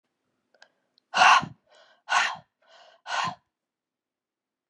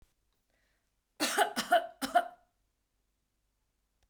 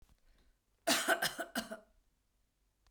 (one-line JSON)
{"exhalation_length": "4.7 s", "exhalation_amplitude": 17845, "exhalation_signal_mean_std_ratio": 0.29, "three_cough_length": "4.1 s", "three_cough_amplitude": 6601, "three_cough_signal_mean_std_ratio": 0.3, "cough_length": "2.9 s", "cough_amplitude": 4335, "cough_signal_mean_std_ratio": 0.36, "survey_phase": "beta (2021-08-13 to 2022-03-07)", "age": "65+", "gender": "Female", "wearing_mask": "No", "symptom_cough_any": true, "smoker_status": "Ex-smoker", "respiratory_condition_asthma": true, "respiratory_condition_other": false, "recruitment_source": "REACT", "submission_delay": "2 days", "covid_test_result": "Negative", "covid_test_method": "RT-qPCR"}